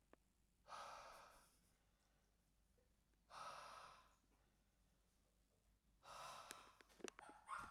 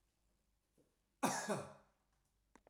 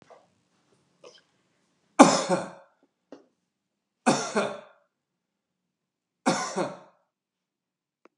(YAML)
exhalation_length: 7.7 s
exhalation_amplitude: 757
exhalation_signal_mean_std_ratio: 0.53
cough_length: 2.7 s
cough_amplitude: 2641
cough_signal_mean_std_ratio: 0.32
three_cough_length: 8.2 s
three_cough_amplitude: 32767
three_cough_signal_mean_std_ratio: 0.24
survey_phase: beta (2021-08-13 to 2022-03-07)
age: 45-64
gender: Male
wearing_mask: 'No'
symptom_none: true
smoker_status: Never smoked
respiratory_condition_asthma: false
respiratory_condition_other: false
recruitment_source: REACT
submission_delay: 3 days
covid_test_result: Negative
covid_test_method: RT-qPCR
influenza_a_test_result: Negative
influenza_b_test_result: Negative